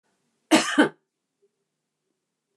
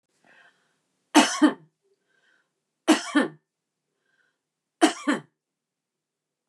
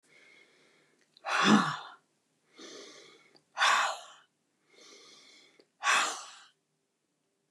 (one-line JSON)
{"cough_length": "2.6 s", "cough_amplitude": 24604, "cough_signal_mean_std_ratio": 0.26, "three_cough_length": "6.5 s", "three_cough_amplitude": 24201, "three_cough_signal_mean_std_ratio": 0.26, "exhalation_length": "7.5 s", "exhalation_amplitude": 8760, "exhalation_signal_mean_std_ratio": 0.34, "survey_phase": "beta (2021-08-13 to 2022-03-07)", "age": "65+", "gender": "Female", "wearing_mask": "No", "symptom_other": true, "smoker_status": "Never smoked", "respiratory_condition_asthma": false, "respiratory_condition_other": false, "recruitment_source": "REACT", "submission_delay": "2 days", "covid_test_result": "Negative", "covid_test_method": "RT-qPCR", "influenza_a_test_result": "Negative", "influenza_b_test_result": "Negative"}